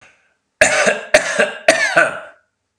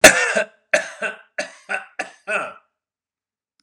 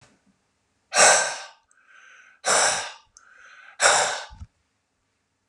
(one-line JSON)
{"cough_length": "2.8 s", "cough_amplitude": 32768, "cough_signal_mean_std_ratio": 0.51, "three_cough_length": "3.6 s", "three_cough_amplitude": 32768, "three_cough_signal_mean_std_ratio": 0.32, "exhalation_length": "5.5 s", "exhalation_amplitude": 25999, "exhalation_signal_mean_std_ratio": 0.37, "survey_phase": "beta (2021-08-13 to 2022-03-07)", "age": "45-64", "gender": "Male", "wearing_mask": "No", "symptom_none": true, "smoker_status": "Ex-smoker", "respiratory_condition_asthma": false, "respiratory_condition_other": false, "recruitment_source": "REACT", "submission_delay": "3 days", "covid_test_result": "Negative", "covid_test_method": "RT-qPCR"}